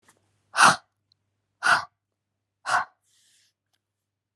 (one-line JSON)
{"exhalation_length": "4.4 s", "exhalation_amplitude": 23422, "exhalation_signal_mean_std_ratio": 0.26, "survey_phase": "alpha (2021-03-01 to 2021-08-12)", "age": "45-64", "gender": "Female", "wearing_mask": "No", "symptom_none": true, "smoker_status": "Never smoked", "respiratory_condition_asthma": false, "respiratory_condition_other": false, "recruitment_source": "REACT", "submission_delay": "2 days", "covid_test_result": "Negative", "covid_test_method": "RT-qPCR"}